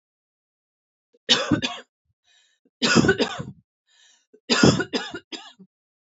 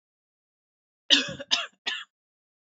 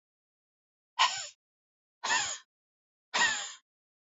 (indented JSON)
{
  "three_cough_length": "6.1 s",
  "three_cough_amplitude": 25575,
  "three_cough_signal_mean_std_ratio": 0.35,
  "cough_length": "2.7 s",
  "cough_amplitude": 27012,
  "cough_signal_mean_std_ratio": 0.28,
  "exhalation_length": "4.2 s",
  "exhalation_amplitude": 10416,
  "exhalation_signal_mean_std_ratio": 0.35,
  "survey_phase": "beta (2021-08-13 to 2022-03-07)",
  "age": "45-64",
  "gender": "Female",
  "wearing_mask": "No",
  "symptom_none": true,
  "smoker_status": "Ex-smoker",
  "respiratory_condition_asthma": false,
  "respiratory_condition_other": false,
  "recruitment_source": "REACT",
  "submission_delay": "1 day",
  "covid_test_result": "Negative",
  "covid_test_method": "RT-qPCR",
  "influenza_a_test_result": "Negative",
  "influenza_b_test_result": "Negative"
}